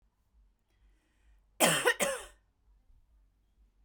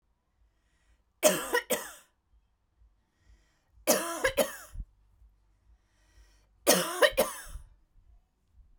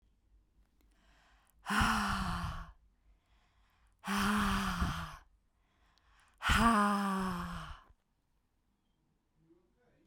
{
  "cough_length": "3.8 s",
  "cough_amplitude": 9705,
  "cough_signal_mean_std_ratio": 0.29,
  "three_cough_length": "8.8 s",
  "three_cough_amplitude": 15765,
  "three_cough_signal_mean_std_ratio": 0.32,
  "exhalation_length": "10.1 s",
  "exhalation_amplitude": 6027,
  "exhalation_signal_mean_std_ratio": 0.47,
  "survey_phase": "beta (2021-08-13 to 2022-03-07)",
  "age": "45-64",
  "gender": "Female",
  "wearing_mask": "No",
  "symptom_fatigue": true,
  "symptom_onset": "5 days",
  "smoker_status": "Never smoked",
  "respiratory_condition_asthma": false,
  "respiratory_condition_other": false,
  "recruitment_source": "REACT",
  "submission_delay": "1 day",
  "covid_test_result": "Negative",
  "covid_test_method": "RT-qPCR"
}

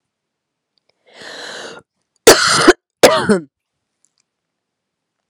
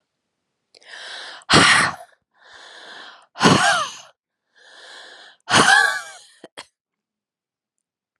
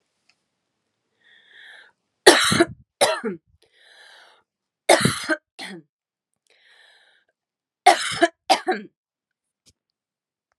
{
  "cough_length": "5.3 s",
  "cough_amplitude": 32768,
  "cough_signal_mean_std_ratio": 0.3,
  "exhalation_length": "8.2 s",
  "exhalation_amplitude": 31929,
  "exhalation_signal_mean_std_ratio": 0.36,
  "three_cough_length": "10.6 s",
  "three_cough_amplitude": 32768,
  "three_cough_signal_mean_std_ratio": 0.27,
  "survey_phase": "alpha (2021-03-01 to 2021-08-12)",
  "age": "18-44",
  "gender": "Female",
  "wearing_mask": "No",
  "symptom_cough_any": true,
  "symptom_diarrhoea": true,
  "symptom_onset": "3 days",
  "smoker_status": "Ex-smoker",
  "respiratory_condition_asthma": false,
  "respiratory_condition_other": false,
  "recruitment_source": "Test and Trace",
  "submission_delay": "2 days",
  "covid_test_result": "Positive",
  "covid_test_method": "ePCR"
}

